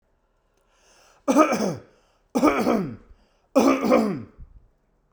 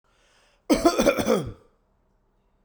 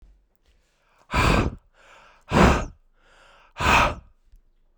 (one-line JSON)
{"three_cough_length": "5.1 s", "three_cough_amplitude": 21800, "three_cough_signal_mean_std_ratio": 0.46, "cough_length": "2.6 s", "cough_amplitude": 20526, "cough_signal_mean_std_ratio": 0.4, "exhalation_length": "4.8 s", "exhalation_amplitude": 23542, "exhalation_signal_mean_std_ratio": 0.39, "survey_phase": "beta (2021-08-13 to 2022-03-07)", "age": "18-44", "gender": "Male", "wearing_mask": "No", "symptom_none": true, "smoker_status": "Never smoked", "respiratory_condition_asthma": false, "respiratory_condition_other": false, "recruitment_source": "REACT", "submission_delay": "1 day", "covid_test_result": "Negative", "covid_test_method": "RT-qPCR"}